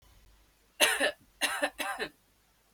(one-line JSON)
{"three_cough_length": "2.7 s", "three_cough_amplitude": 16327, "three_cough_signal_mean_std_ratio": 0.42, "survey_phase": "beta (2021-08-13 to 2022-03-07)", "age": "18-44", "gender": "Female", "wearing_mask": "No", "symptom_cough_any": true, "symptom_onset": "4 days", "smoker_status": "Never smoked", "respiratory_condition_asthma": true, "respiratory_condition_other": false, "recruitment_source": "REACT", "submission_delay": "4 days", "covid_test_result": "Negative", "covid_test_method": "RT-qPCR"}